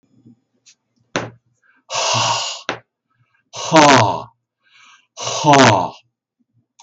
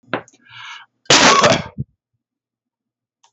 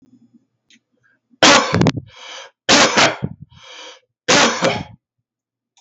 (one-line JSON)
{"exhalation_length": "6.8 s", "exhalation_amplitude": 32768, "exhalation_signal_mean_std_ratio": 0.4, "cough_length": "3.3 s", "cough_amplitude": 32768, "cough_signal_mean_std_ratio": 0.36, "three_cough_length": "5.8 s", "three_cough_amplitude": 32768, "three_cough_signal_mean_std_ratio": 0.43, "survey_phase": "beta (2021-08-13 to 2022-03-07)", "age": "45-64", "gender": "Male", "wearing_mask": "No", "symptom_none": true, "smoker_status": "Never smoked", "respiratory_condition_asthma": false, "respiratory_condition_other": false, "recruitment_source": "REACT", "submission_delay": "1 day", "covid_test_result": "Negative", "covid_test_method": "RT-qPCR"}